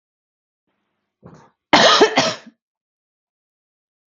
cough_length: 4.1 s
cough_amplitude: 32768
cough_signal_mean_std_ratio: 0.29
survey_phase: beta (2021-08-13 to 2022-03-07)
age: 18-44
gender: Female
wearing_mask: 'No'
symptom_none: true
smoker_status: Current smoker (1 to 10 cigarettes per day)
respiratory_condition_asthma: false
respiratory_condition_other: false
recruitment_source: REACT
submission_delay: 1 day
covid_test_result: Negative
covid_test_method: RT-qPCR
influenza_a_test_result: Negative
influenza_b_test_result: Negative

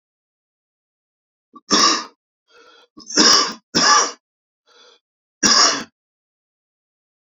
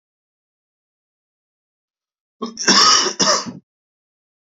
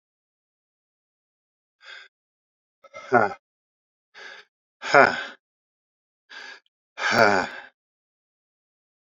three_cough_length: 7.3 s
three_cough_amplitude: 32767
three_cough_signal_mean_std_ratio: 0.36
cough_length: 4.4 s
cough_amplitude: 29745
cough_signal_mean_std_ratio: 0.33
exhalation_length: 9.1 s
exhalation_amplitude: 28167
exhalation_signal_mean_std_ratio: 0.24
survey_phase: beta (2021-08-13 to 2022-03-07)
age: 18-44
gender: Male
wearing_mask: 'No'
symptom_new_continuous_cough: true
symptom_runny_or_blocked_nose: true
symptom_shortness_of_breath: true
symptom_abdominal_pain: true
symptom_fatigue: true
symptom_headache: true
smoker_status: Never smoked
respiratory_condition_asthma: false
respiratory_condition_other: false
recruitment_source: Test and Trace
submission_delay: 2 days
covid_test_result: Positive
covid_test_method: RT-qPCR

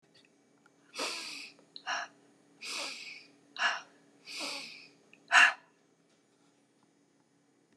exhalation_length: 7.8 s
exhalation_amplitude: 13394
exhalation_signal_mean_std_ratio: 0.29
survey_phase: beta (2021-08-13 to 2022-03-07)
age: 65+
gender: Female
wearing_mask: 'No'
symptom_cough_any: true
smoker_status: Never smoked
respiratory_condition_asthma: false
respiratory_condition_other: false
recruitment_source: Test and Trace
submission_delay: 1 day
covid_test_result: Positive
covid_test_method: RT-qPCR
covid_ct_value: 22.7
covid_ct_gene: ORF1ab gene
covid_ct_mean: 23.5
covid_viral_load: 20000 copies/ml
covid_viral_load_category: Low viral load (10K-1M copies/ml)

